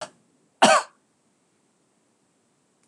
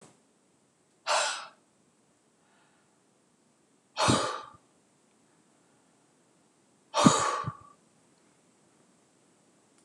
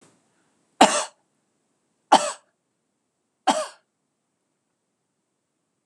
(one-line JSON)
{"cough_length": "2.9 s", "cough_amplitude": 25950, "cough_signal_mean_std_ratio": 0.22, "exhalation_length": "9.8 s", "exhalation_amplitude": 19732, "exhalation_signal_mean_std_ratio": 0.27, "three_cough_length": "5.9 s", "three_cough_amplitude": 26028, "three_cough_signal_mean_std_ratio": 0.21, "survey_phase": "beta (2021-08-13 to 2022-03-07)", "age": "45-64", "gender": "Female", "wearing_mask": "No", "symptom_headache": true, "smoker_status": "Never smoked", "respiratory_condition_asthma": true, "respiratory_condition_other": false, "recruitment_source": "REACT", "submission_delay": "1 day", "covid_test_result": "Negative", "covid_test_method": "RT-qPCR", "influenza_a_test_result": "Negative", "influenza_b_test_result": "Negative"}